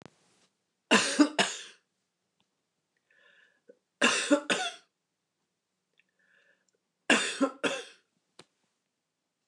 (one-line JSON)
{"three_cough_length": "9.5 s", "three_cough_amplitude": 13357, "three_cough_signal_mean_std_ratio": 0.3, "survey_phase": "beta (2021-08-13 to 2022-03-07)", "age": "65+", "gender": "Female", "wearing_mask": "No", "symptom_none": true, "smoker_status": "Ex-smoker", "respiratory_condition_asthma": false, "respiratory_condition_other": false, "recruitment_source": "REACT", "submission_delay": "1 day", "covid_test_result": "Negative", "covid_test_method": "RT-qPCR", "influenza_a_test_result": "Negative", "influenza_b_test_result": "Negative"}